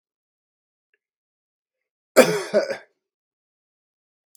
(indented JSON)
{
  "cough_length": "4.4 s",
  "cough_amplitude": 32768,
  "cough_signal_mean_std_ratio": 0.21,
  "survey_phase": "beta (2021-08-13 to 2022-03-07)",
  "age": "65+",
  "gender": "Male",
  "wearing_mask": "No",
  "symptom_cough_any": true,
  "smoker_status": "Current smoker (1 to 10 cigarettes per day)",
  "respiratory_condition_asthma": false,
  "respiratory_condition_other": false,
  "recruitment_source": "REACT",
  "submission_delay": "2 days",
  "covid_test_result": "Negative",
  "covid_test_method": "RT-qPCR",
  "influenza_a_test_result": "Unknown/Void",
  "influenza_b_test_result": "Unknown/Void"
}